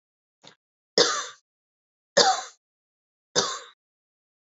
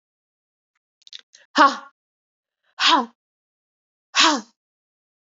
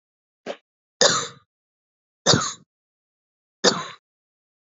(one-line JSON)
{"three_cough_length": "4.4 s", "three_cough_amplitude": 24347, "three_cough_signal_mean_std_ratio": 0.29, "exhalation_length": "5.3 s", "exhalation_amplitude": 27795, "exhalation_signal_mean_std_ratio": 0.27, "cough_length": "4.6 s", "cough_amplitude": 28445, "cough_signal_mean_std_ratio": 0.28, "survey_phase": "alpha (2021-03-01 to 2021-08-12)", "age": "18-44", "gender": "Female", "wearing_mask": "No", "symptom_cough_any": true, "symptom_shortness_of_breath": true, "symptom_fatigue": true, "symptom_fever_high_temperature": true, "symptom_headache": true, "symptom_change_to_sense_of_smell_or_taste": true, "symptom_loss_of_taste": true, "symptom_onset": "5 days", "smoker_status": "Never smoked", "respiratory_condition_asthma": false, "respiratory_condition_other": false, "recruitment_source": "Test and Trace", "submission_delay": "1 day", "covid_test_result": "Positive", "covid_test_method": "RT-qPCR", "covid_ct_value": 12.8, "covid_ct_gene": "ORF1ab gene", "covid_ct_mean": 13.4, "covid_viral_load": "40000000 copies/ml", "covid_viral_load_category": "High viral load (>1M copies/ml)"}